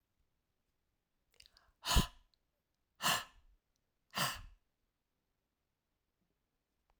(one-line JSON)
{"exhalation_length": "7.0 s", "exhalation_amplitude": 4943, "exhalation_signal_mean_std_ratio": 0.22, "survey_phase": "beta (2021-08-13 to 2022-03-07)", "age": "45-64", "gender": "Female", "wearing_mask": "No", "symptom_cough_any": true, "symptom_fatigue": true, "symptom_change_to_sense_of_smell_or_taste": true, "symptom_loss_of_taste": true, "symptom_onset": "4 days", "smoker_status": "Ex-smoker", "respiratory_condition_asthma": false, "respiratory_condition_other": false, "recruitment_source": "Test and Trace", "submission_delay": "2 days", "covid_test_result": "Positive", "covid_test_method": "RT-qPCR", "covid_ct_value": 16.8, "covid_ct_gene": "ORF1ab gene", "covid_ct_mean": 17.3, "covid_viral_load": "2100000 copies/ml", "covid_viral_load_category": "High viral load (>1M copies/ml)"}